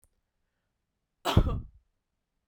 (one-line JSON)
{"cough_length": "2.5 s", "cough_amplitude": 14945, "cough_signal_mean_std_ratio": 0.26, "survey_phase": "beta (2021-08-13 to 2022-03-07)", "age": "18-44", "gender": "Female", "wearing_mask": "No", "symptom_runny_or_blocked_nose": true, "smoker_status": "Never smoked", "respiratory_condition_asthma": false, "respiratory_condition_other": false, "recruitment_source": "Test and Trace", "submission_delay": "2 days", "covid_test_result": "Positive", "covid_test_method": "RT-qPCR", "covid_ct_value": 18.8, "covid_ct_gene": "ORF1ab gene", "covid_ct_mean": 20.3, "covid_viral_load": "220000 copies/ml", "covid_viral_load_category": "Low viral load (10K-1M copies/ml)"}